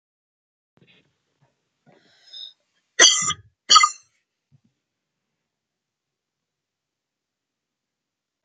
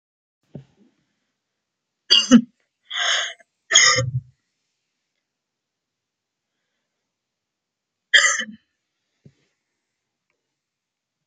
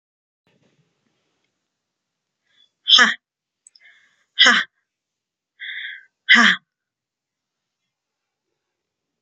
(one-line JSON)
{"cough_length": "8.4 s", "cough_amplitude": 31138, "cough_signal_mean_std_ratio": 0.18, "three_cough_length": "11.3 s", "three_cough_amplitude": 32171, "three_cough_signal_mean_std_ratio": 0.25, "exhalation_length": "9.2 s", "exhalation_amplitude": 31459, "exhalation_signal_mean_std_ratio": 0.23, "survey_phase": "beta (2021-08-13 to 2022-03-07)", "age": "45-64", "gender": "Female", "wearing_mask": "No", "symptom_none": true, "smoker_status": "Ex-smoker", "respiratory_condition_asthma": false, "respiratory_condition_other": false, "recruitment_source": "REACT", "submission_delay": "4 days", "covid_test_result": "Negative", "covid_test_method": "RT-qPCR", "influenza_a_test_result": "Negative", "influenza_b_test_result": "Negative"}